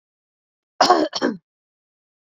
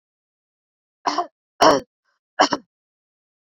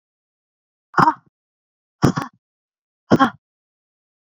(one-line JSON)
{"cough_length": "2.3 s", "cough_amplitude": 27845, "cough_signal_mean_std_ratio": 0.31, "three_cough_length": "3.5 s", "three_cough_amplitude": 31125, "three_cough_signal_mean_std_ratio": 0.26, "exhalation_length": "4.3 s", "exhalation_amplitude": 32768, "exhalation_signal_mean_std_ratio": 0.25, "survey_phase": "beta (2021-08-13 to 2022-03-07)", "age": "45-64", "gender": "Female", "wearing_mask": "No", "symptom_none": true, "smoker_status": "Ex-smoker", "respiratory_condition_asthma": true, "respiratory_condition_other": false, "recruitment_source": "REACT", "submission_delay": "1 day", "covid_test_result": "Negative", "covid_test_method": "RT-qPCR"}